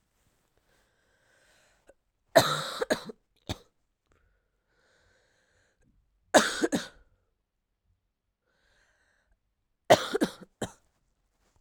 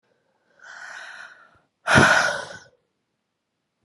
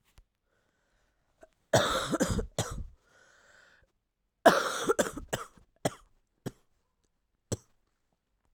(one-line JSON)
{"three_cough_length": "11.6 s", "three_cough_amplitude": 21194, "three_cough_signal_mean_std_ratio": 0.21, "exhalation_length": "3.8 s", "exhalation_amplitude": 29446, "exhalation_signal_mean_std_ratio": 0.32, "cough_length": "8.5 s", "cough_amplitude": 18783, "cough_signal_mean_std_ratio": 0.3, "survey_phase": "alpha (2021-03-01 to 2021-08-12)", "age": "18-44", "gender": "Female", "wearing_mask": "No", "symptom_cough_any": true, "symptom_fever_high_temperature": true, "symptom_change_to_sense_of_smell_or_taste": true, "symptom_onset": "6 days", "smoker_status": "Never smoked", "respiratory_condition_asthma": false, "respiratory_condition_other": false, "recruitment_source": "Test and Trace", "submission_delay": "1 day", "covid_test_result": "Positive", "covid_test_method": "RT-qPCR", "covid_ct_value": 22.8, "covid_ct_gene": "ORF1ab gene"}